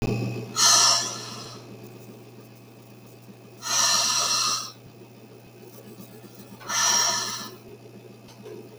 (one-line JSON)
{"exhalation_length": "8.8 s", "exhalation_amplitude": 22137, "exhalation_signal_mean_std_ratio": 0.55, "survey_phase": "beta (2021-08-13 to 2022-03-07)", "age": "45-64", "gender": "Female", "wearing_mask": "No", "symptom_none": true, "smoker_status": "Never smoked", "respiratory_condition_asthma": false, "respiratory_condition_other": false, "recruitment_source": "REACT", "submission_delay": "2 days", "covid_test_result": "Negative", "covid_test_method": "RT-qPCR", "influenza_a_test_result": "Negative", "influenza_b_test_result": "Negative"}